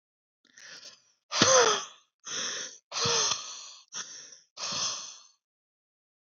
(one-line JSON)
{"exhalation_length": "6.2 s", "exhalation_amplitude": 15095, "exhalation_signal_mean_std_ratio": 0.42, "survey_phase": "beta (2021-08-13 to 2022-03-07)", "age": "18-44", "gender": "Male", "wearing_mask": "No", "symptom_none": true, "symptom_onset": "3 days", "smoker_status": "Ex-smoker", "respiratory_condition_asthma": false, "respiratory_condition_other": false, "recruitment_source": "REACT", "submission_delay": "1 day", "covid_test_result": "Negative", "covid_test_method": "RT-qPCR", "influenza_a_test_result": "Negative", "influenza_b_test_result": "Negative"}